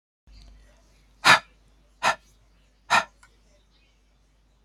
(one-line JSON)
{"exhalation_length": "4.6 s", "exhalation_amplitude": 26535, "exhalation_signal_mean_std_ratio": 0.23, "survey_phase": "beta (2021-08-13 to 2022-03-07)", "age": "65+", "gender": "Female", "wearing_mask": "No", "symptom_none": true, "smoker_status": "Ex-smoker", "respiratory_condition_asthma": false, "respiratory_condition_other": false, "recruitment_source": "REACT", "submission_delay": "1 day", "covid_test_result": "Negative", "covid_test_method": "RT-qPCR", "influenza_a_test_result": "Unknown/Void", "influenza_b_test_result": "Unknown/Void"}